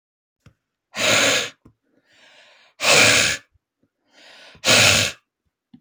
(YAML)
exhalation_length: 5.8 s
exhalation_amplitude: 29141
exhalation_signal_mean_std_ratio: 0.42
survey_phase: beta (2021-08-13 to 2022-03-07)
age: 18-44
gender: Male
wearing_mask: 'No'
symptom_none: true
smoker_status: Ex-smoker
respiratory_condition_asthma: false
respiratory_condition_other: false
recruitment_source: REACT
submission_delay: 2 days
covid_test_result: Negative
covid_test_method: RT-qPCR
influenza_a_test_result: Negative
influenza_b_test_result: Negative